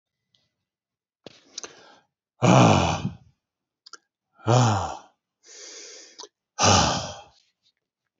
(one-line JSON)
{"exhalation_length": "8.2 s", "exhalation_amplitude": 21822, "exhalation_signal_mean_std_ratio": 0.35, "survey_phase": "beta (2021-08-13 to 2022-03-07)", "age": "45-64", "gender": "Male", "wearing_mask": "No", "symptom_cough_any": true, "symptom_new_continuous_cough": true, "symptom_runny_or_blocked_nose": true, "symptom_fatigue": true, "symptom_headache": true, "symptom_other": true, "smoker_status": "Never smoked", "respiratory_condition_asthma": false, "respiratory_condition_other": false, "recruitment_source": "Test and Trace", "submission_delay": "1 day", "covid_test_result": "Positive", "covid_test_method": "RT-qPCR"}